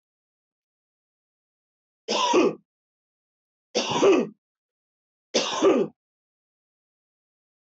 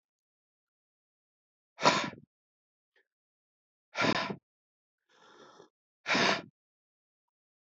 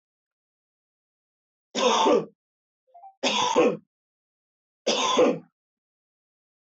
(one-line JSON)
{"cough_length": "7.8 s", "cough_amplitude": 11535, "cough_signal_mean_std_ratio": 0.34, "exhalation_length": "7.7 s", "exhalation_amplitude": 13717, "exhalation_signal_mean_std_ratio": 0.27, "three_cough_length": "6.7 s", "three_cough_amplitude": 10753, "three_cough_signal_mean_std_ratio": 0.39, "survey_phase": "alpha (2021-03-01 to 2021-08-12)", "age": "45-64", "gender": "Male", "wearing_mask": "No", "symptom_none": true, "smoker_status": "Ex-smoker", "respiratory_condition_asthma": false, "respiratory_condition_other": false, "recruitment_source": "REACT", "submission_delay": "1 day", "covid_test_result": "Negative", "covid_test_method": "RT-qPCR"}